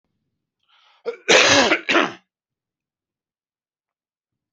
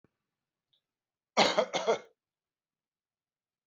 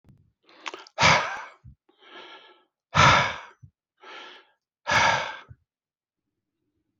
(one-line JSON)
{"three_cough_length": "4.5 s", "three_cough_amplitude": 29226, "three_cough_signal_mean_std_ratio": 0.32, "cough_length": "3.7 s", "cough_amplitude": 12797, "cough_signal_mean_std_ratio": 0.27, "exhalation_length": "7.0 s", "exhalation_amplitude": 21926, "exhalation_signal_mean_std_ratio": 0.33, "survey_phase": "beta (2021-08-13 to 2022-03-07)", "age": "45-64", "gender": "Male", "wearing_mask": "No", "symptom_diarrhoea": true, "symptom_onset": "5 days", "smoker_status": "Ex-smoker", "respiratory_condition_asthma": false, "respiratory_condition_other": false, "recruitment_source": "Test and Trace", "submission_delay": "2 days", "covid_test_result": "Positive", "covid_test_method": "RT-qPCR", "covid_ct_value": 17.5, "covid_ct_gene": "ORF1ab gene", "covid_ct_mean": 17.9, "covid_viral_load": "1300000 copies/ml", "covid_viral_load_category": "High viral load (>1M copies/ml)"}